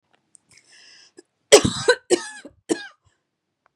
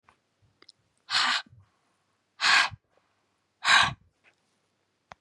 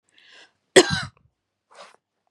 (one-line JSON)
{"three_cough_length": "3.8 s", "three_cough_amplitude": 32768, "three_cough_signal_mean_std_ratio": 0.25, "exhalation_length": "5.2 s", "exhalation_amplitude": 13342, "exhalation_signal_mean_std_ratio": 0.32, "cough_length": "2.3 s", "cough_amplitude": 32747, "cough_signal_mean_std_ratio": 0.21, "survey_phase": "beta (2021-08-13 to 2022-03-07)", "age": "45-64", "gender": "Female", "wearing_mask": "No", "symptom_cough_any": true, "symptom_runny_or_blocked_nose": true, "symptom_shortness_of_breath": true, "symptom_sore_throat": true, "symptom_fatigue": true, "symptom_fever_high_temperature": true, "symptom_headache": true, "symptom_change_to_sense_of_smell_or_taste": true, "symptom_other": true, "symptom_onset": "3 days", "smoker_status": "Never smoked", "respiratory_condition_asthma": false, "respiratory_condition_other": false, "recruitment_source": "Test and Trace", "submission_delay": "2 days", "covid_test_result": "Positive", "covid_test_method": "RT-qPCR", "covid_ct_value": 26.3, "covid_ct_gene": "ORF1ab gene", "covid_ct_mean": 26.7, "covid_viral_load": "1700 copies/ml", "covid_viral_load_category": "Minimal viral load (< 10K copies/ml)"}